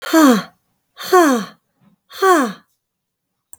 {"exhalation_length": "3.6 s", "exhalation_amplitude": 32766, "exhalation_signal_mean_std_ratio": 0.44, "survey_phase": "beta (2021-08-13 to 2022-03-07)", "age": "45-64", "gender": "Female", "wearing_mask": "No", "symptom_none": true, "smoker_status": "Ex-smoker", "respiratory_condition_asthma": false, "respiratory_condition_other": false, "recruitment_source": "REACT", "submission_delay": "1 day", "covid_test_result": "Negative", "covid_test_method": "RT-qPCR", "influenza_a_test_result": "Negative", "influenza_b_test_result": "Negative"}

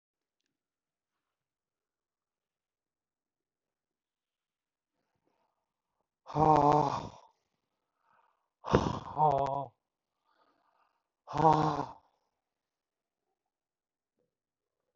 {"exhalation_length": "15.0 s", "exhalation_amplitude": 16157, "exhalation_signal_mean_std_ratio": 0.25, "survey_phase": "beta (2021-08-13 to 2022-03-07)", "age": "65+", "gender": "Male", "wearing_mask": "No", "symptom_none": true, "smoker_status": "Never smoked", "respiratory_condition_asthma": false, "respiratory_condition_other": false, "recruitment_source": "REACT", "submission_delay": "2 days", "covid_test_result": "Negative", "covid_test_method": "RT-qPCR", "influenza_a_test_result": "Negative", "influenza_b_test_result": "Negative"}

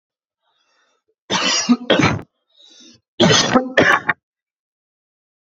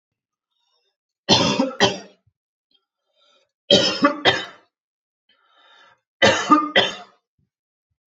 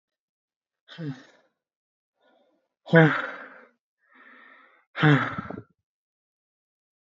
{"cough_length": "5.5 s", "cough_amplitude": 30820, "cough_signal_mean_std_ratio": 0.42, "three_cough_length": "8.1 s", "three_cough_amplitude": 29793, "three_cough_signal_mean_std_ratio": 0.35, "exhalation_length": "7.2 s", "exhalation_amplitude": 26477, "exhalation_signal_mean_std_ratio": 0.25, "survey_phase": "beta (2021-08-13 to 2022-03-07)", "age": "18-44", "gender": "Male", "wearing_mask": "No", "symptom_headache": true, "smoker_status": "Never smoked", "respiratory_condition_asthma": false, "respiratory_condition_other": false, "recruitment_source": "REACT", "submission_delay": "1 day", "covid_test_result": "Negative", "covid_test_method": "RT-qPCR"}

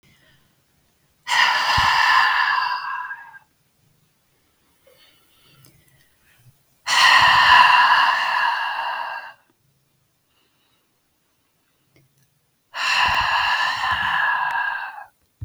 {"exhalation_length": "15.4 s", "exhalation_amplitude": 32129, "exhalation_signal_mean_std_ratio": 0.52, "survey_phase": "beta (2021-08-13 to 2022-03-07)", "age": "45-64", "gender": "Female", "wearing_mask": "No", "symptom_none": true, "smoker_status": "Never smoked", "respiratory_condition_asthma": false, "respiratory_condition_other": false, "recruitment_source": "REACT", "submission_delay": "1 day", "covid_test_result": "Negative", "covid_test_method": "RT-qPCR", "influenza_a_test_result": "Negative", "influenza_b_test_result": "Negative"}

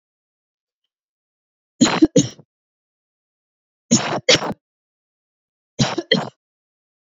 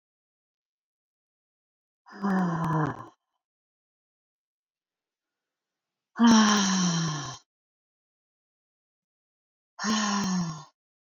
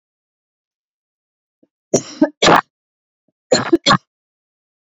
{"three_cough_length": "7.2 s", "three_cough_amplitude": 29441, "three_cough_signal_mean_std_ratio": 0.28, "exhalation_length": "11.2 s", "exhalation_amplitude": 13969, "exhalation_signal_mean_std_ratio": 0.38, "cough_length": "4.9 s", "cough_amplitude": 30137, "cough_signal_mean_std_ratio": 0.28, "survey_phase": "beta (2021-08-13 to 2022-03-07)", "age": "45-64", "gender": "Female", "wearing_mask": "No", "symptom_none": true, "smoker_status": "Never smoked", "respiratory_condition_asthma": false, "respiratory_condition_other": false, "recruitment_source": "REACT", "submission_delay": "9 days", "covid_test_result": "Negative", "covid_test_method": "RT-qPCR"}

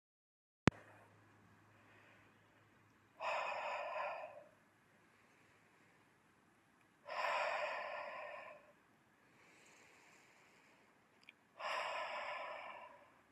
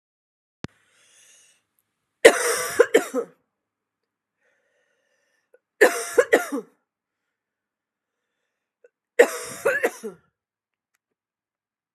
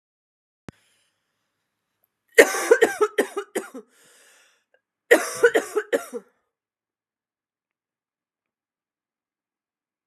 {"exhalation_length": "13.3 s", "exhalation_amplitude": 11320, "exhalation_signal_mean_std_ratio": 0.43, "three_cough_length": "11.9 s", "three_cough_amplitude": 32768, "three_cough_signal_mean_std_ratio": 0.24, "cough_length": "10.1 s", "cough_amplitude": 32767, "cough_signal_mean_std_ratio": 0.24, "survey_phase": "alpha (2021-03-01 to 2021-08-12)", "age": "18-44", "gender": "Female", "wearing_mask": "No", "symptom_fever_high_temperature": true, "symptom_loss_of_taste": true, "symptom_onset": "3 days", "smoker_status": "Never smoked", "respiratory_condition_asthma": false, "respiratory_condition_other": false, "recruitment_source": "Test and Trace", "submission_delay": "1 day", "covid_test_result": "Positive", "covid_test_method": "RT-qPCR", "covid_ct_value": 28.6, "covid_ct_gene": "ORF1ab gene", "covid_ct_mean": 29.2, "covid_viral_load": "270 copies/ml", "covid_viral_load_category": "Minimal viral load (< 10K copies/ml)"}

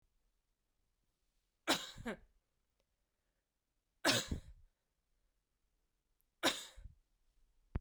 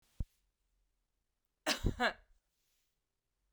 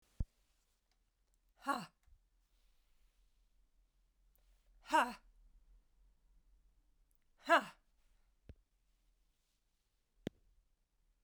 {"three_cough_length": "7.8 s", "three_cough_amplitude": 4367, "three_cough_signal_mean_std_ratio": 0.25, "cough_length": "3.5 s", "cough_amplitude": 3889, "cough_signal_mean_std_ratio": 0.26, "exhalation_length": "11.2 s", "exhalation_amplitude": 4101, "exhalation_signal_mean_std_ratio": 0.18, "survey_phase": "beta (2021-08-13 to 2022-03-07)", "age": "18-44", "gender": "Female", "wearing_mask": "No", "symptom_cough_any": true, "symptom_runny_or_blocked_nose": true, "symptom_fatigue": true, "symptom_headache": true, "symptom_change_to_sense_of_smell_or_taste": true, "symptom_other": true, "symptom_onset": "8 days", "smoker_status": "Ex-smoker", "respiratory_condition_asthma": false, "respiratory_condition_other": false, "recruitment_source": "Test and Trace", "submission_delay": "1 day", "covid_test_result": "Positive", "covid_test_method": "RT-qPCR", "covid_ct_value": 18.0, "covid_ct_gene": "ORF1ab gene", "covid_ct_mean": 18.6, "covid_viral_load": "810000 copies/ml", "covid_viral_load_category": "Low viral load (10K-1M copies/ml)"}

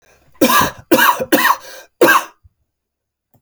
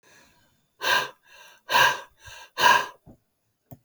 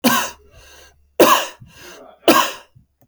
{"cough_length": "3.4 s", "cough_amplitude": 32768, "cough_signal_mean_std_ratio": 0.47, "exhalation_length": "3.8 s", "exhalation_amplitude": 19836, "exhalation_signal_mean_std_ratio": 0.37, "three_cough_length": "3.1 s", "three_cough_amplitude": 32768, "three_cough_signal_mean_std_ratio": 0.4, "survey_phase": "alpha (2021-03-01 to 2021-08-12)", "age": "65+", "gender": "Male", "wearing_mask": "No", "symptom_none": true, "smoker_status": "Prefer not to say", "respiratory_condition_asthma": false, "respiratory_condition_other": false, "recruitment_source": "REACT", "submission_delay": "2 days", "covid_test_result": "Negative", "covid_test_method": "RT-qPCR"}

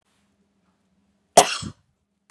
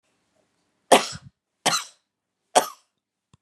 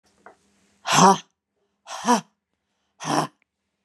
{"cough_length": "2.3 s", "cough_amplitude": 32768, "cough_signal_mean_std_ratio": 0.18, "three_cough_length": "3.4 s", "three_cough_amplitude": 31567, "three_cough_signal_mean_std_ratio": 0.23, "exhalation_length": "3.8 s", "exhalation_amplitude": 27628, "exhalation_signal_mean_std_ratio": 0.31, "survey_phase": "beta (2021-08-13 to 2022-03-07)", "age": "45-64", "gender": "Female", "wearing_mask": "No", "symptom_none": true, "smoker_status": "Never smoked", "respiratory_condition_asthma": false, "respiratory_condition_other": false, "recruitment_source": "REACT", "submission_delay": "3 days", "covid_test_result": "Negative", "covid_test_method": "RT-qPCR", "influenza_a_test_result": "Negative", "influenza_b_test_result": "Negative"}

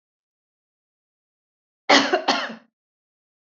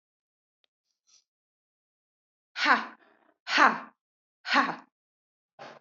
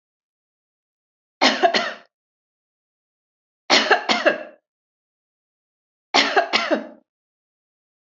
{"cough_length": "3.5 s", "cough_amplitude": 27982, "cough_signal_mean_std_ratio": 0.27, "exhalation_length": "5.8 s", "exhalation_amplitude": 17383, "exhalation_signal_mean_std_ratio": 0.26, "three_cough_length": "8.2 s", "three_cough_amplitude": 29453, "three_cough_signal_mean_std_ratio": 0.33, "survey_phase": "beta (2021-08-13 to 2022-03-07)", "age": "45-64", "gender": "Female", "wearing_mask": "No", "symptom_none": true, "smoker_status": "Never smoked", "respiratory_condition_asthma": false, "respiratory_condition_other": false, "recruitment_source": "REACT", "submission_delay": "1 day", "covid_test_result": "Negative", "covid_test_method": "RT-qPCR"}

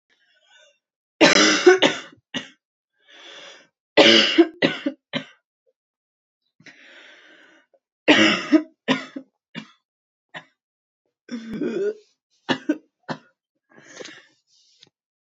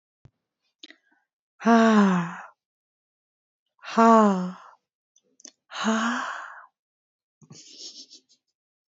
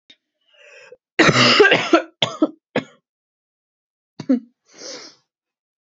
{"three_cough_length": "15.3 s", "three_cough_amplitude": 28861, "three_cough_signal_mean_std_ratio": 0.31, "exhalation_length": "8.9 s", "exhalation_amplitude": 20861, "exhalation_signal_mean_std_ratio": 0.35, "cough_length": "5.9 s", "cough_amplitude": 32768, "cough_signal_mean_std_ratio": 0.35, "survey_phase": "beta (2021-08-13 to 2022-03-07)", "age": "18-44", "gender": "Female", "wearing_mask": "No", "symptom_cough_any": true, "symptom_new_continuous_cough": true, "symptom_runny_or_blocked_nose": true, "symptom_sore_throat": true, "symptom_fatigue": true, "symptom_other": true, "symptom_onset": "3 days", "smoker_status": "Never smoked", "respiratory_condition_asthma": false, "respiratory_condition_other": false, "recruitment_source": "Test and Trace", "submission_delay": "1 day", "covid_test_result": "Positive", "covid_test_method": "RT-qPCR", "covid_ct_value": 32.6, "covid_ct_gene": "ORF1ab gene"}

